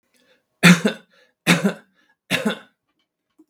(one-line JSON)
{"three_cough_length": "3.5 s", "three_cough_amplitude": 32768, "three_cough_signal_mean_std_ratio": 0.31, "survey_phase": "beta (2021-08-13 to 2022-03-07)", "age": "65+", "gender": "Male", "wearing_mask": "No", "symptom_cough_any": true, "symptom_runny_or_blocked_nose": true, "symptom_onset": "12 days", "smoker_status": "Ex-smoker", "respiratory_condition_asthma": false, "respiratory_condition_other": false, "recruitment_source": "REACT", "submission_delay": "1 day", "covid_test_result": "Negative", "covid_test_method": "RT-qPCR"}